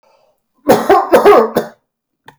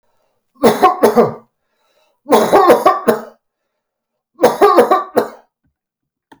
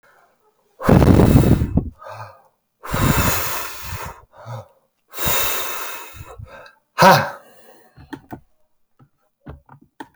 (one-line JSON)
{"cough_length": "2.4 s", "cough_amplitude": 32768, "cough_signal_mean_std_ratio": 0.49, "three_cough_length": "6.4 s", "three_cough_amplitude": 32768, "three_cough_signal_mean_std_ratio": 0.46, "exhalation_length": "10.2 s", "exhalation_amplitude": 32768, "exhalation_signal_mean_std_ratio": 0.42, "survey_phase": "beta (2021-08-13 to 2022-03-07)", "age": "65+", "gender": "Male", "wearing_mask": "No", "symptom_none": true, "smoker_status": "Never smoked", "respiratory_condition_asthma": false, "respiratory_condition_other": false, "recruitment_source": "REACT", "submission_delay": "1 day", "covid_test_result": "Negative", "covid_test_method": "RT-qPCR", "influenza_a_test_result": "Negative", "influenza_b_test_result": "Negative"}